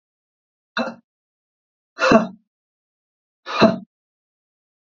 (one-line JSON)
{"exhalation_length": "4.9 s", "exhalation_amplitude": 27501, "exhalation_signal_mean_std_ratio": 0.26, "survey_phase": "beta (2021-08-13 to 2022-03-07)", "age": "45-64", "gender": "Male", "wearing_mask": "No", "symptom_none": true, "smoker_status": "Never smoked", "respiratory_condition_asthma": false, "respiratory_condition_other": false, "recruitment_source": "REACT", "submission_delay": "5 days", "covid_test_result": "Negative", "covid_test_method": "RT-qPCR", "influenza_a_test_result": "Unknown/Void", "influenza_b_test_result": "Unknown/Void"}